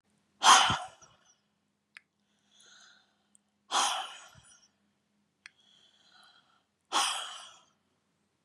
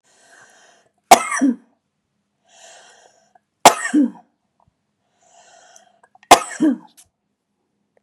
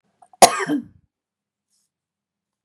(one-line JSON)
{"exhalation_length": "8.4 s", "exhalation_amplitude": 15092, "exhalation_signal_mean_std_ratio": 0.25, "three_cough_length": "8.0 s", "three_cough_amplitude": 32768, "three_cough_signal_mean_std_ratio": 0.24, "cough_length": "2.6 s", "cough_amplitude": 32768, "cough_signal_mean_std_ratio": 0.21, "survey_phase": "beta (2021-08-13 to 2022-03-07)", "age": "65+", "gender": "Female", "wearing_mask": "No", "symptom_none": true, "smoker_status": "Never smoked", "respiratory_condition_asthma": false, "respiratory_condition_other": false, "recruitment_source": "REACT", "submission_delay": "2 days", "covid_test_result": "Negative", "covid_test_method": "RT-qPCR", "influenza_a_test_result": "Negative", "influenza_b_test_result": "Negative"}